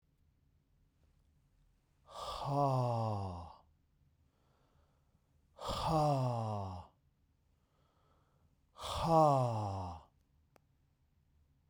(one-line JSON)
{"exhalation_length": "11.7 s", "exhalation_amplitude": 4685, "exhalation_signal_mean_std_ratio": 0.44, "survey_phase": "beta (2021-08-13 to 2022-03-07)", "age": "45-64", "gender": "Male", "wearing_mask": "No", "symptom_fatigue": true, "symptom_headache": true, "smoker_status": "Never smoked", "respiratory_condition_asthma": false, "respiratory_condition_other": false, "recruitment_source": "REACT", "submission_delay": "2 days", "covid_test_result": "Negative", "covid_test_method": "RT-qPCR"}